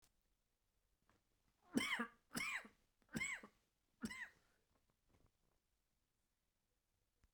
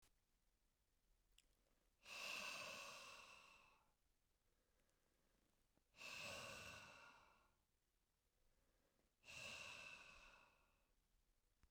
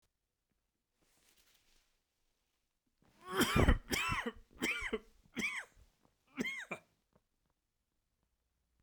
{
  "three_cough_length": "7.3 s",
  "three_cough_amplitude": 1789,
  "three_cough_signal_mean_std_ratio": 0.31,
  "exhalation_length": "11.7 s",
  "exhalation_amplitude": 337,
  "exhalation_signal_mean_std_ratio": 0.51,
  "cough_length": "8.8 s",
  "cough_amplitude": 6432,
  "cough_signal_mean_std_ratio": 0.32,
  "survey_phase": "beta (2021-08-13 to 2022-03-07)",
  "age": "45-64",
  "gender": "Male",
  "wearing_mask": "No",
  "symptom_cough_any": true,
  "symptom_fever_high_temperature": true,
  "symptom_headache": true,
  "symptom_onset": "3 days",
  "smoker_status": "Never smoked",
  "respiratory_condition_asthma": false,
  "respiratory_condition_other": false,
  "recruitment_source": "Test and Trace",
  "submission_delay": "2 days",
  "covid_test_result": "Positive",
  "covid_test_method": "RT-qPCR"
}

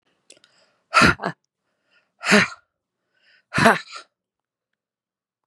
{
  "exhalation_length": "5.5 s",
  "exhalation_amplitude": 32767,
  "exhalation_signal_mean_std_ratio": 0.27,
  "survey_phase": "beta (2021-08-13 to 2022-03-07)",
  "age": "45-64",
  "gender": "Female",
  "wearing_mask": "No",
  "symptom_runny_or_blocked_nose": true,
  "symptom_sore_throat": true,
  "symptom_fatigue": true,
  "symptom_onset": "13 days",
  "smoker_status": "Never smoked",
  "respiratory_condition_asthma": false,
  "respiratory_condition_other": false,
  "recruitment_source": "REACT",
  "submission_delay": "2 days",
  "covid_test_result": "Negative",
  "covid_test_method": "RT-qPCR"
}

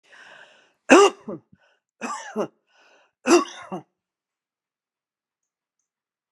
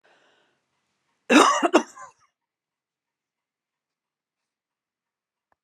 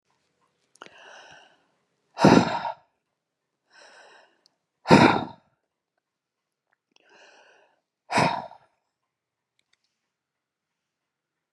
{
  "three_cough_length": "6.3 s",
  "three_cough_amplitude": 32729,
  "three_cough_signal_mean_std_ratio": 0.24,
  "cough_length": "5.6 s",
  "cough_amplitude": 24964,
  "cough_signal_mean_std_ratio": 0.21,
  "exhalation_length": "11.5 s",
  "exhalation_amplitude": 32450,
  "exhalation_signal_mean_std_ratio": 0.22,
  "survey_phase": "beta (2021-08-13 to 2022-03-07)",
  "age": "65+",
  "gender": "Female",
  "wearing_mask": "No",
  "symptom_none": true,
  "smoker_status": "Never smoked",
  "respiratory_condition_asthma": false,
  "respiratory_condition_other": false,
  "recruitment_source": "REACT",
  "submission_delay": "2 days",
  "covid_test_result": "Negative",
  "covid_test_method": "RT-qPCR"
}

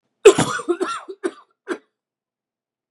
{
  "three_cough_length": "2.9 s",
  "three_cough_amplitude": 32768,
  "three_cough_signal_mean_std_ratio": 0.29,
  "survey_phase": "beta (2021-08-13 to 2022-03-07)",
  "age": "45-64",
  "gender": "Male",
  "wearing_mask": "No",
  "symptom_cough_any": true,
  "symptom_runny_or_blocked_nose": true,
  "symptom_sore_throat": true,
  "symptom_fatigue": true,
  "symptom_other": true,
  "symptom_onset": "4 days",
  "smoker_status": "Never smoked",
  "respiratory_condition_asthma": false,
  "respiratory_condition_other": false,
  "recruitment_source": "Test and Trace",
  "submission_delay": "2 days",
  "covid_test_result": "Positive",
  "covid_test_method": "RT-qPCR",
  "covid_ct_value": 18.1,
  "covid_ct_gene": "ORF1ab gene",
  "covid_ct_mean": 18.2,
  "covid_viral_load": "1000000 copies/ml",
  "covid_viral_load_category": "High viral load (>1M copies/ml)"
}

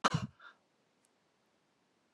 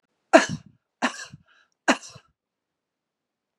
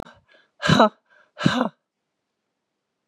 {
  "cough_length": "2.1 s",
  "cough_amplitude": 5561,
  "cough_signal_mean_std_ratio": 0.22,
  "three_cough_length": "3.6 s",
  "three_cough_amplitude": 31511,
  "three_cough_signal_mean_std_ratio": 0.21,
  "exhalation_length": "3.1 s",
  "exhalation_amplitude": 28381,
  "exhalation_signal_mean_std_ratio": 0.29,
  "survey_phase": "beta (2021-08-13 to 2022-03-07)",
  "age": "65+",
  "gender": "Female",
  "wearing_mask": "No",
  "symptom_none": true,
  "smoker_status": "Ex-smoker",
  "respiratory_condition_asthma": false,
  "respiratory_condition_other": true,
  "recruitment_source": "REACT",
  "submission_delay": "3 days",
  "covid_test_result": "Negative",
  "covid_test_method": "RT-qPCR",
  "influenza_a_test_result": "Negative",
  "influenza_b_test_result": "Negative"
}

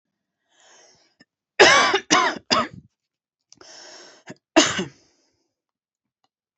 {
  "cough_length": "6.6 s",
  "cough_amplitude": 28339,
  "cough_signal_mean_std_ratio": 0.31,
  "survey_phase": "beta (2021-08-13 to 2022-03-07)",
  "age": "45-64",
  "gender": "Female",
  "wearing_mask": "No",
  "symptom_cough_any": true,
  "symptom_new_continuous_cough": true,
  "symptom_runny_or_blocked_nose": true,
  "symptom_shortness_of_breath": true,
  "symptom_sore_throat": true,
  "symptom_fatigue": true,
  "symptom_headache": true,
  "symptom_onset": "2 days",
  "smoker_status": "Ex-smoker",
  "respiratory_condition_asthma": false,
  "respiratory_condition_other": false,
  "recruitment_source": "Test and Trace",
  "submission_delay": "1 day",
  "covid_test_result": "Positive",
  "covid_test_method": "RT-qPCR",
  "covid_ct_value": 21.5,
  "covid_ct_gene": "ORF1ab gene",
  "covid_ct_mean": 22.2,
  "covid_viral_load": "53000 copies/ml",
  "covid_viral_load_category": "Low viral load (10K-1M copies/ml)"
}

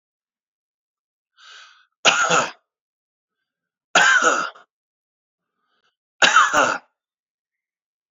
{
  "three_cough_length": "8.1 s",
  "three_cough_amplitude": 32768,
  "three_cough_signal_mean_std_ratio": 0.34,
  "survey_phase": "beta (2021-08-13 to 2022-03-07)",
  "age": "65+",
  "gender": "Male",
  "wearing_mask": "No",
  "symptom_none": true,
  "symptom_onset": "4 days",
  "smoker_status": "Ex-smoker",
  "respiratory_condition_asthma": false,
  "respiratory_condition_other": false,
  "recruitment_source": "REACT",
  "submission_delay": "1 day",
  "covid_test_result": "Negative",
  "covid_test_method": "RT-qPCR"
}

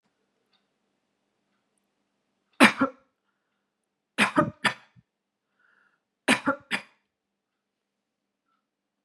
{
  "three_cough_length": "9.0 s",
  "three_cough_amplitude": 25747,
  "three_cough_signal_mean_std_ratio": 0.21,
  "survey_phase": "beta (2021-08-13 to 2022-03-07)",
  "age": "65+",
  "gender": "Female",
  "wearing_mask": "No",
  "symptom_none": true,
  "smoker_status": "Never smoked",
  "respiratory_condition_asthma": true,
  "respiratory_condition_other": false,
  "recruitment_source": "REACT",
  "submission_delay": "1 day",
  "covid_test_result": "Negative",
  "covid_test_method": "RT-qPCR",
  "influenza_a_test_result": "Negative",
  "influenza_b_test_result": "Negative"
}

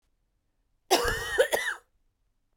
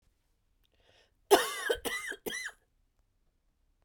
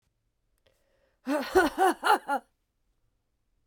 {
  "cough_length": "2.6 s",
  "cough_amplitude": 13965,
  "cough_signal_mean_std_ratio": 0.4,
  "three_cough_length": "3.8 s",
  "three_cough_amplitude": 13855,
  "three_cough_signal_mean_std_ratio": 0.29,
  "exhalation_length": "3.7 s",
  "exhalation_amplitude": 11753,
  "exhalation_signal_mean_std_ratio": 0.36,
  "survey_phase": "beta (2021-08-13 to 2022-03-07)",
  "age": "45-64",
  "gender": "Female",
  "wearing_mask": "No",
  "symptom_cough_any": true,
  "symptom_runny_or_blocked_nose": true,
  "symptom_sore_throat": true,
  "symptom_onset": "2 days",
  "smoker_status": "Never smoked",
  "respiratory_condition_asthma": false,
  "respiratory_condition_other": false,
  "recruitment_source": "Test and Trace",
  "submission_delay": "1 day",
  "covid_test_result": "Negative",
  "covid_test_method": "RT-qPCR"
}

